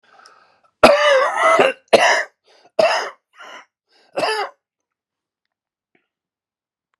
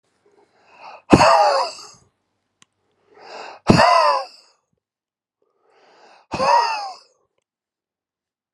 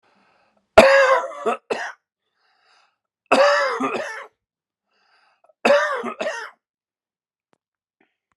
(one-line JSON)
{"cough_length": "7.0 s", "cough_amplitude": 32768, "cough_signal_mean_std_ratio": 0.39, "exhalation_length": "8.5 s", "exhalation_amplitude": 32768, "exhalation_signal_mean_std_ratio": 0.35, "three_cough_length": "8.4 s", "three_cough_amplitude": 32768, "three_cough_signal_mean_std_ratio": 0.36, "survey_phase": "alpha (2021-03-01 to 2021-08-12)", "age": "45-64", "gender": "Male", "wearing_mask": "No", "symptom_cough_any": true, "symptom_abdominal_pain": true, "symptom_diarrhoea": true, "symptom_fatigue": true, "symptom_change_to_sense_of_smell_or_taste": true, "symptom_loss_of_taste": true, "symptom_onset": "6 days", "smoker_status": "Ex-smoker", "respiratory_condition_asthma": false, "respiratory_condition_other": false, "recruitment_source": "Test and Trace", "submission_delay": "1 day", "covid_test_result": "Positive", "covid_test_method": "RT-qPCR", "covid_ct_value": 18.8, "covid_ct_gene": "ORF1ab gene"}